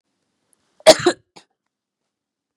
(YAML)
cough_length: 2.6 s
cough_amplitude: 32768
cough_signal_mean_std_ratio: 0.19
survey_phase: beta (2021-08-13 to 2022-03-07)
age: 45-64
gender: Female
wearing_mask: 'No'
symptom_cough_any: true
symptom_runny_or_blocked_nose: true
symptom_headache: true
symptom_onset: 1 day
smoker_status: Never smoked
respiratory_condition_asthma: false
respiratory_condition_other: false
recruitment_source: Test and Trace
submission_delay: 1 day
covid_test_result: Positive
covid_test_method: RT-qPCR
covid_ct_value: 18.4
covid_ct_gene: ORF1ab gene
covid_ct_mean: 18.7
covid_viral_load: 730000 copies/ml
covid_viral_load_category: Low viral load (10K-1M copies/ml)